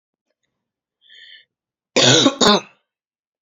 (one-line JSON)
{"cough_length": "3.4 s", "cough_amplitude": 31244, "cough_signal_mean_std_ratio": 0.33, "survey_phase": "beta (2021-08-13 to 2022-03-07)", "age": "18-44", "gender": "Female", "wearing_mask": "No", "symptom_cough_any": true, "symptom_shortness_of_breath": true, "symptom_sore_throat": true, "symptom_fatigue": true, "symptom_headache": true, "symptom_other": true, "symptom_onset": "2 days", "smoker_status": "Ex-smoker", "respiratory_condition_asthma": false, "respiratory_condition_other": false, "recruitment_source": "Test and Trace", "submission_delay": "1 day", "covid_test_result": "Positive", "covid_test_method": "RT-qPCR", "covid_ct_value": 27.5, "covid_ct_gene": "ORF1ab gene"}